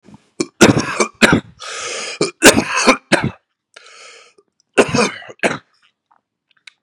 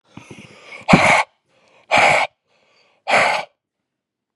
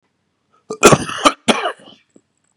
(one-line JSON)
{"three_cough_length": "6.8 s", "three_cough_amplitude": 32768, "three_cough_signal_mean_std_ratio": 0.39, "exhalation_length": "4.4 s", "exhalation_amplitude": 32768, "exhalation_signal_mean_std_ratio": 0.4, "cough_length": "2.6 s", "cough_amplitude": 32768, "cough_signal_mean_std_ratio": 0.33, "survey_phase": "beta (2021-08-13 to 2022-03-07)", "age": "18-44", "gender": "Male", "wearing_mask": "No", "symptom_runny_or_blocked_nose": true, "symptom_fever_high_temperature": true, "smoker_status": "Current smoker (e-cigarettes or vapes only)", "respiratory_condition_asthma": false, "respiratory_condition_other": false, "recruitment_source": "REACT", "submission_delay": "2 days", "covid_test_result": "Positive", "covid_test_method": "RT-qPCR", "covid_ct_value": 20.0, "covid_ct_gene": "E gene", "influenza_a_test_result": "Unknown/Void", "influenza_b_test_result": "Unknown/Void"}